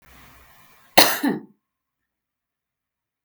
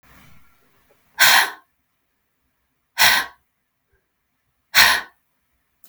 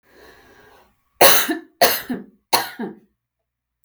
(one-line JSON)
{"cough_length": "3.2 s", "cough_amplitude": 32768, "cough_signal_mean_std_ratio": 0.23, "exhalation_length": "5.9 s", "exhalation_amplitude": 32768, "exhalation_signal_mean_std_ratio": 0.29, "three_cough_length": "3.8 s", "three_cough_amplitude": 32768, "three_cough_signal_mean_std_ratio": 0.34, "survey_phase": "beta (2021-08-13 to 2022-03-07)", "age": "45-64", "gender": "Female", "wearing_mask": "No", "symptom_cough_any": true, "symptom_runny_or_blocked_nose": true, "symptom_fatigue": true, "symptom_headache": true, "smoker_status": "Ex-smoker", "respiratory_condition_asthma": false, "respiratory_condition_other": false, "recruitment_source": "REACT", "submission_delay": "-1 day", "covid_test_result": "Negative", "covid_test_method": "RT-qPCR", "influenza_a_test_result": "Unknown/Void", "influenza_b_test_result": "Unknown/Void"}